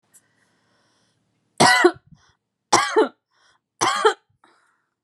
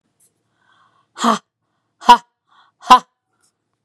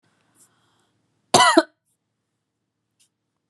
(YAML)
three_cough_length: 5.0 s
three_cough_amplitude: 29774
three_cough_signal_mean_std_ratio: 0.33
exhalation_length: 3.8 s
exhalation_amplitude: 32768
exhalation_signal_mean_std_ratio: 0.22
cough_length: 3.5 s
cough_amplitude: 32378
cough_signal_mean_std_ratio: 0.21
survey_phase: beta (2021-08-13 to 2022-03-07)
age: 45-64
gender: Female
wearing_mask: 'No'
symptom_none: true
smoker_status: Never smoked
respiratory_condition_asthma: false
respiratory_condition_other: false
recruitment_source: REACT
submission_delay: 2 days
covid_test_result: Negative
covid_test_method: RT-qPCR
influenza_a_test_result: Negative
influenza_b_test_result: Negative